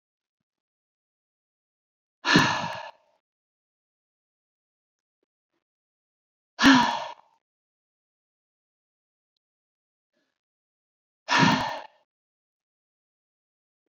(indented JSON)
{
  "exhalation_length": "13.9 s",
  "exhalation_amplitude": 20037,
  "exhalation_signal_mean_std_ratio": 0.23,
  "survey_phase": "beta (2021-08-13 to 2022-03-07)",
  "age": "65+",
  "gender": "Female",
  "wearing_mask": "No",
  "symptom_none": true,
  "smoker_status": "Never smoked",
  "respiratory_condition_asthma": false,
  "respiratory_condition_other": false,
  "recruitment_source": "REACT",
  "submission_delay": "2 days",
  "covid_test_result": "Negative",
  "covid_test_method": "RT-qPCR",
  "influenza_a_test_result": "Negative",
  "influenza_b_test_result": "Negative"
}